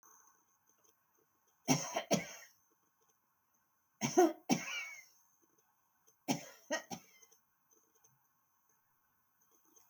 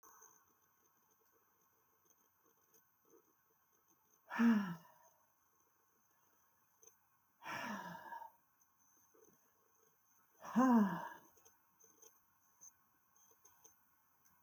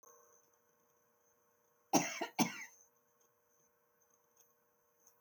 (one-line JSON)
{"three_cough_length": "9.9 s", "three_cough_amplitude": 6226, "three_cough_signal_mean_std_ratio": 0.27, "exhalation_length": "14.4 s", "exhalation_amplitude": 2559, "exhalation_signal_mean_std_ratio": 0.25, "cough_length": "5.2 s", "cough_amplitude": 4865, "cough_signal_mean_std_ratio": 0.23, "survey_phase": "beta (2021-08-13 to 2022-03-07)", "age": "65+", "gender": "Female", "wearing_mask": "No", "symptom_none": true, "smoker_status": "Never smoked", "respiratory_condition_asthma": false, "respiratory_condition_other": false, "recruitment_source": "REACT", "submission_delay": "2 days", "covid_test_result": "Negative", "covid_test_method": "RT-qPCR", "influenza_a_test_result": "Negative", "influenza_b_test_result": "Negative"}